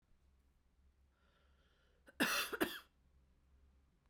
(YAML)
cough_length: 4.1 s
cough_amplitude: 3536
cough_signal_mean_std_ratio: 0.29
survey_phase: beta (2021-08-13 to 2022-03-07)
age: 45-64
gender: Female
wearing_mask: 'No'
symptom_cough_any: true
symptom_sore_throat: true
smoker_status: Never smoked
respiratory_condition_asthma: false
respiratory_condition_other: false
recruitment_source: Test and Trace
submission_delay: 1 day
covid_test_result: Positive
covid_test_method: RT-qPCR
covid_ct_value: 24.3
covid_ct_gene: ORF1ab gene